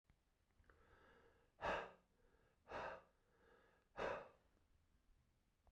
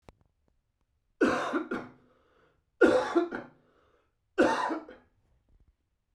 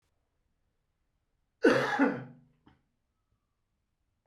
{
  "exhalation_length": "5.7 s",
  "exhalation_amplitude": 794,
  "exhalation_signal_mean_std_ratio": 0.35,
  "three_cough_length": "6.1 s",
  "three_cough_amplitude": 12146,
  "three_cough_signal_mean_std_ratio": 0.37,
  "cough_length": "4.3 s",
  "cough_amplitude": 9191,
  "cough_signal_mean_std_ratio": 0.27,
  "survey_phase": "beta (2021-08-13 to 2022-03-07)",
  "age": "65+",
  "gender": "Male",
  "wearing_mask": "No",
  "symptom_cough_any": true,
  "symptom_change_to_sense_of_smell_or_taste": true,
  "smoker_status": "Never smoked",
  "respiratory_condition_asthma": false,
  "respiratory_condition_other": false,
  "recruitment_source": "REACT",
  "submission_delay": "1 day",
  "covid_test_result": "Negative",
  "covid_test_method": "RT-qPCR"
}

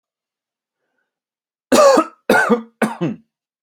{
  "cough_length": "3.6 s",
  "cough_amplitude": 29515,
  "cough_signal_mean_std_ratio": 0.39,
  "survey_phase": "alpha (2021-03-01 to 2021-08-12)",
  "age": "18-44",
  "gender": "Male",
  "wearing_mask": "No",
  "symptom_none": true,
  "smoker_status": "Ex-smoker",
  "respiratory_condition_asthma": false,
  "respiratory_condition_other": false,
  "recruitment_source": "REACT",
  "submission_delay": "1 day",
  "covid_test_result": "Negative",
  "covid_test_method": "RT-qPCR"
}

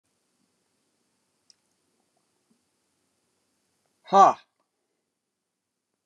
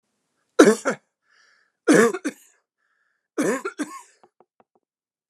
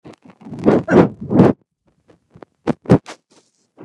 {
  "exhalation_length": "6.1 s",
  "exhalation_amplitude": 19780,
  "exhalation_signal_mean_std_ratio": 0.14,
  "three_cough_length": "5.3 s",
  "three_cough_amplitude": 29204,
  "three_cough_signal_mean_std_ratio": 0.29,
  "cough_length": "3.8 s",
  "cough_amplitude": 29204,
  "cough_signal_mean_std_ratio": 0.37,
  "survey_phase": "beta (2021-08-13 to 2022-03-07)",
  "age": "65+",
  "gender": "Male",
  "wearing_mask": "No",
  "symptom_none": true,
  "smoker_status": "Ex-smoker",
  "respiratory_condition_asthma": false,
  "respiratory_condition_other": false,
  "recruitment_source": "REACT",
  "submission_delay": "1 day",
  "covid_test_result": "Negative",
  "covid_test_method": "RT-qPCR"
}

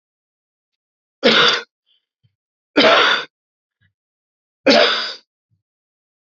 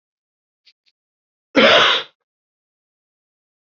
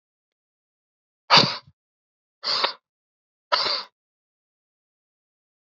{
  "three_cough_length": "6.4 s",
  "three_cough_amplitude": 31194,
  "three_cough_signal_mean_std_ratio": 0.35,
  "cough_length": "3.7 s",
  "cough_amplitude": 29080,
  "cough_signal_mean_std_ratio": 0.28,
  "exhalation_length": "5.6 s",
  "exhalation_amplitude": 27988,
  "exhalation_signal_mean_std_ratio": 0.25,
  "survey_phase": "beta (2021-08-13 to 2022-03-07)",
  "age": "18-44",
  "gender": "Male",
  "wearing_mask": "No",
  "symptom_cough_any": true,
  "symptom_new_continuous_cough": true,
  "symptom_runny_or_blocked_nose": true,
  "symptom_sore_throat": true,
  "symptom_abdominal_pain": true,
  "symptom_fatigue": true,
  "symptom_headache": true,
  "symptom_onset": "3 days",
  "smoker_status": "Never smoked",
  "respiratory_condition_asthma": false,
  "respiratory_condition_other": false,
  "recruitment_source": "Test and Trace",
  "submission_delay": "1 day",
  "covid_test_result": "Positive",
  "covid_test_method": "RT-qPCR",
  "covid_ct_value": 20.0,
  "covid_ct_gene": "ORF1ab gene",
  "covid_ct_mean": 20.5,
  "covid_viral_load": "200000 copies/ml",
  "covid_viral_load_category": "Low viral load (10K-1M copies/ml)"
}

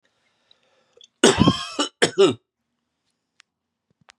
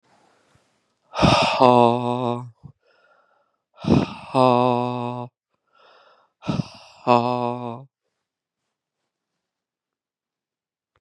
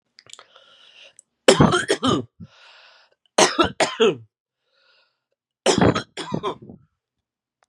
{
  "cough_length": "4.2 s",
  "cough_amplitude": 31460,
  "cough_signal_mean_std_ratio": 0.3,
  "exhalation_length": "11.0 s",
  "exhalation_amplitude": 32635,
  "exhalation_signal_mean_std_ratio": 0.34,
  "three_cough_length": "7.7 s",
  "three_cough_amplitude": 32768,
  "three_cough_signal_mean_std_ratio": 0.36,
  "survey_phase": "beta (2021-08-13 to 2022-03-07)",
  "age": "18-44",
  "gender": "Male",
  "wearing_mask": "No",
  "symptom_cough_any": true,
  "symptom_runny_or_blocked_nose": true,
  "symptom_diarrhoea": true,
  "symptom_fatigue": true,
  "symptom_onset": "5 days",
  "smoker_status": "Never smoked",
  "respiratory_condition_asthma": false,
  "respiratory_condition_other": false,
  "recruitment_source": "Test and Trace",
  "submission_delay": "2 days",
  "covid_test_result": "Positive",
  "covid_test_method": "RT-qPCR",
  "covid_ct_value": 20.6,
  "covid_ct_gene": "ORF1ab gene",
  "covid_ct_mean": 20.9,
  "covid_viral_load": "140000 copies/ml",
  "covid_viral_load_category": "Low viral load (10K-1M copies/ml)"
}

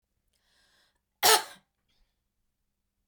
{
  "cough_length": "3.1 s",
  "cough_amplitude": 15681,
  "cough_signal_mean_std_ratio": 0.19,
  "survey_phase": "beta (2021-08-13 to 2022-03-07)",
  "age": "45-64",
  "gender": "Female",
  "wearing_mask": "No",
  "symptom_none": true,
  "symptom_onset": "11 days",
  "smoker_status": "Never smoked",
  "respiratory_condition_asthma": false,
  "respiratory_condition_other": false,
  "recruitment_source": "REACT",
  "submission_delay": "-1 day",
  "covid_test_result": "Negative",
  "covid_test_method": "RT-qPCR",
  "influenza_a_test_result": "Negative",
  "influenza_b_test_result": "Negative"
}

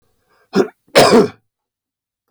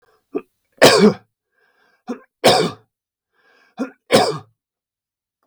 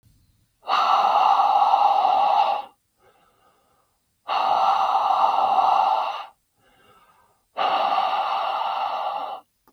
{
  "cough_length": "2.3 s",
  "cough_amplitude": 32768,
  "cough_signal_mean_std_ratio": 0.36,
  "three_cough_length": "5.5 s",
  "three_cough_amplitude": 32768,
  "three_cough_signal_mean_std_ratio": 0.32,
  "exhalation_length": "9.7 s",
  "exhalation_amplitude": 17345,
  "exhalation_signal_mean_std_ratio": 0.72,
  "survey_phase": "beta (2021-08-13 to 2022-03-07)",
  "age": "45-64",
  "gender": "Male",
  "wearing_mask": "No",
  "symptom_none": true,
  "smoker_status": "Never smoked",
  "respiratory_condition_asthma": false,
  "respiratory_condition_other": false,
  "recruitment_source": "REACT",
  "submission_delay": "4 days",
  "covid_test_result": "Negative",
  "covid_test_method": "RT-qPCR",
  "influenza_a_test_result": "Unknown/Void",
  "influenza_b_test_result": "Unknown/Void"
}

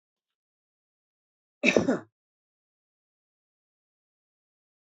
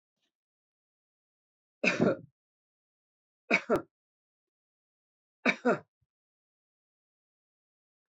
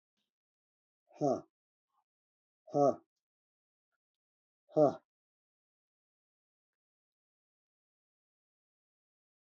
{
  "cough_length": "4.9 s",
  "cough_amplitude": 18681,
  "cough_signal_mean_std_ratio": 0.18,
  "three_cough_length": "8.1 s",
  "three_cough_amplitude": 9632,
  "three_cough_signal_mean_std_ratio": 0.22,
  "exhalation_length": "9.6 s",
  "exhalation_amplitude": 5778,
  "exhalation_signal_mean_std_ratio": 0.18,
  "survey_phase": "beta (2021-08-13 to 2022-03-07)",
  "age": "65+",
  "gender": "Male",
  "wearing_mask": "No",
  "symptom_none": true,
  "smoker_status": "Never smoked",
  "respiratory_condition_asthma": false,
  "respiratory_condition_other": false,
  "recruitment_source": "REACT",
  "submission_delay": "1 day",
  "covid_test_result": "Negative",
  "covid_test_method": "RT-qPCR",
  "influenza_a_test_result": "Negative",
  "influenza_b_test_result": "Negative"
}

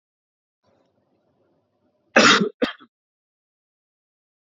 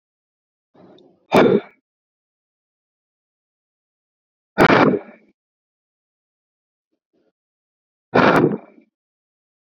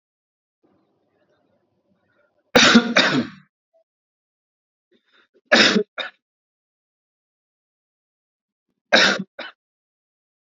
{
  "cough_length": "4.4 s",
  "cough_amplitude": 29179,
  "cough_signal_mean_std_ratio": 0.22,
  "exhalation_length": "9.6 s",
  "exhalation_amplitude": 29312,
  "exhalation_signal_mean_std_ratio": 0.26,
  "three_cough_length": "10.6 s",
  "three_cough_amplitude": 32764,
  "three_cough_signal_mean_std_ratio": 0.26,
  "survey_phase": "alpha (2021-03-01 to 2021-08-12)",
  "age": "18-44",
  "gender": "Male",
  "wearing_mask": "No",
  "symptom_none": true,
  "smoker_status": "Never smoked",
  "respiratory_condition_asthma": false,
  "respiratory_condition_other": false,
  "recruitment_source": "REACT",
  "submission_delay": "0 days",
  "covid_test_result": "Negative",
  "covid_test_method": "RT-qPCR"
}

